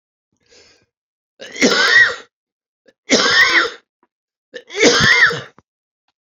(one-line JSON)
{"three_cough_length": "6.2 s", "three_cough_amplitude": 30648, "three_cough_signal_mean_std_ratio": 0.46, "survey_phase": "beta (2021-08-13 to 2022-03-07)", "age": "65+", "gender": "Male", "wearing_mask": "No", "symptom_cough_any": true, "smoker_status": "Ex-smoker", "respiratory_condition_asthma": true, "respiratory_condition_other": true, "recruitment_source": "REACT", "submission_delay": "2 days", "covid_test_result": "Negative", "covid_test_method": "RT-qPCR"}